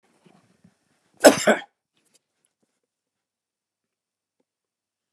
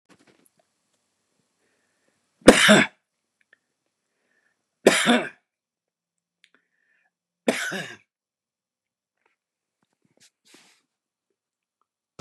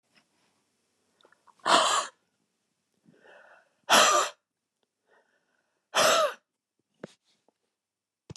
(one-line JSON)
{"cough_length": "5.1 s", "cough_amplitude": 32768, "cough_signal_mean_std_ratio": 0.15, "three_cough_length": "12.2 s", "three_cough_amplitude": 32768, "three_cough_signal_mean_std_ratio": 0.2, "exhalation_length": "8.4 s", "exhalation_amplitude": 15302, "exhalation_signal_mean_std_ratio": 0.3, "survey_phase": "beta (2021-08-13 to 2022-03-07)", "age": "65+", "gender": "Male", "wearing_mask": "No", "symptom_cough_any": true, "smoker_status": "Never smoked", "respiratory_condition_asthma": false, "respiratory_condition_other": false, "recruitment_source": "REACT", "submission_delay": "0 days", "covid_test_result": "Negative", "covid_test_method": "RT-qPCR", "influenza_a_test_result": "Negative", "influenza_b_test_result": "Negative"}